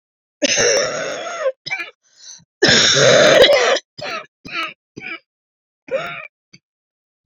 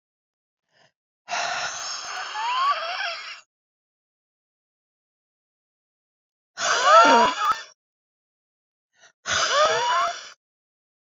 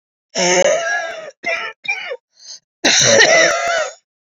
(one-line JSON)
{"three_cough_length": "7.3 s", "three_cough_amplitude": 31906, "three_cough_signal_mean_std_ratio": 0.5, "exhalation_length": "11.1 s", "exhalation_amplitude": 24673, "exhalation_signal_mean_std_ratio": 0.41, "cough_length": "4.4 s", "cough_amplitude": 32767, "cough_signal_mean_std_ratio": 0.63, "survey_phase": "beta (2021-08-13 to 2022-03-07)", "age": "45-64", "gender": "Female", "wearing_mask": "No", "symptom_cough_any": true, "symptom_new_continuous_cough": true, "symptom_sore_throat": true, "symptom_fatigue": true, "symptom_headache": true, "symptom_onset": "9 days", "smoker_status": "Ex-smoker", "respiratory_condition_asthma": false, "respiratory_condition_other": false, "recruitment_source": "Test and Trace", "submission_delay": "1 day", "covid_test_result": "Positive", "covid_test_method": "RT-qPCR", "covid_ct_value": 19.9, "covid_ct_gene": "ORF1ab gene", "covid_ct_mean": 20.5, "covid_viral_load": "190000 copies/ml", "covid_viral_load_category": "Low viral load (10K-1M copies/ml)"}